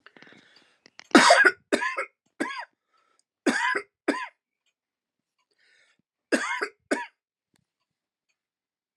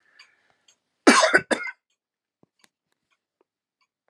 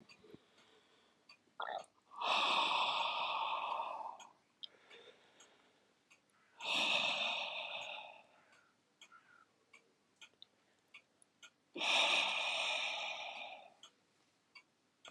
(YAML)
three_cough_length: 9.0 s
three_cough_amplitude: 29192
three_cough_signal_mean_std_ratio: 0.29
cough_length: 4.1 s
cough_amplitude: 28925
cough_signal_mean_std_ratio: 0.24
exhalation_length: 15.1 s
exhalation_amplitude: 3174
exhalation_signal_mean_std_ratio: 0.5
survey_phase: alpha (2021-03-01 to 2021-08-12)
age: 45-64
gender: Male
wearing_mask: 'No'
symptom_none: true
smoker_status: Never smoked
respiratory_condition_asthma: false
respiratory_condition_other: false
recruitment_source: REACT
submission_delay: 3 days
covid_test_result: Negative
covid_test_method: RT-qPCR